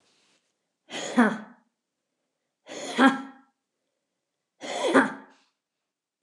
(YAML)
exhalation_length: 6.2 s
exhalation_amplitude: 20674
exhalation_signal_mean_std_ratio: 0.29
survey_phase: beta (2021-08-13 to 2022-03-07)
age: 45-64
gender: Female
wearing_mask: 'No'
symptom_none: true
smoker_status: Never smoked
respiratory_condition_asthma: false
respiratory_condition_other: false
recruitment_source: REACT
submission_delay: 1 day
covid_test_result: Negative
covid_test_method: RT-qPCR
influenza_a_test_result: Negative
influenza_b_test_result: Negative